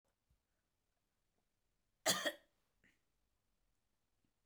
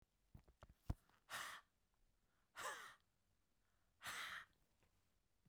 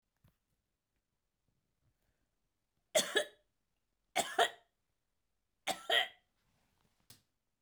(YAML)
cough_length: 4.5 s
cough_amplitude: 3208
cough_signal_mean_std_ratio: 0.18
exhalation_length: 5.5 s
exhalation_amplitude: 1054
exhalation_signal_mean_std_ratio: 0.39
three_cough_length: 7.6 s
three_cough_amplitude: 5217
three_cough_signal_mean_std_ratio: 0.24
survey_phase: beta (2021-08-13 to 2022-03-07)
age: 65+
gender: Female
wearing_mask: 'No'
symptom_none: true
smoker_status: Never smoked
respiratory_condition_asthma: false
respiratory_condition_other: false
recruitment_source: REACT
submission_delay: 1 day
covid_test_result: Negative
covid_test_method: RT-qPCR